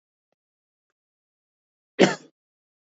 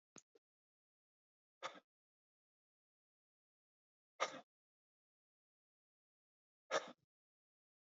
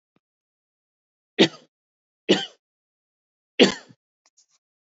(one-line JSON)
{"cough_length": "3.0 s", "cough_amplitude": 26100, "cough_signal_mean_std_ratio": 0.15, "exhalation_length": "7.9 s", "exhalation_amplitude": 1868, "exhalation_signal_mean_std_ratio": 0.15, "three_cough_length": "4.9 s", "three_cough_amplitude": 27228, "three_cough_signal_mean_std_ratio": 0.19, "survey_phase": "beta (2021-08-13 to 2022-03-07)", "age": "18-44", "gender": "Male", "wearing_mask": "No", "symptom_cough_any": true, "symptom_runny_or_blocked_nose": true, "symptom_fatigue": true, "symptom_fever_high_temperature": true, "symptom_headache": true, "symptom_change_to_sense_of_smell_or_taste": true, "symptom_loss_of_taste": true, "symptom_onset": "4 days", "smoker_status": "Never smoked", "respiratory_condition_asthma": false, "respiratory_condition_other": false, "recruitment_source": "Test and Trace", "submission_delay": "2 days", "covid_test_result": "Positive", "covid_test_method": "RT-qPCR", "covid_ct_value": 15.0, "covid_ct_gene": "ORF1ab gene", "covid_ct_mean": 15.3, "covid_viral_load": "9400000 copies/ml", "covid_viral_load_category": "High viral load (>1M copies/ml)"}